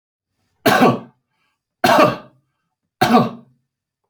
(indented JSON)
{
  "cough_length": "4.1 s",
  "cough_amplitude": 28141,
  "cough_signal_mean_std_ratio": 0.39,
  "survey_phase": "alpha (2021-03-01 to 2021-08-12)",
  "age": "45-64",
  "gender": "Male",
  "wearing_mask": "No",
  "symptom_none": true,
  "smoker_status": "Never smoked",
  "respiratory_condition_asthma": false,
  "respiratory_condition_other": false,
  "recruitment_source": "REACT",
  "submission_delay": "1 day",
  "covid_test_result": "Negative",
  "covid_test_method": "RT-qPCR"
}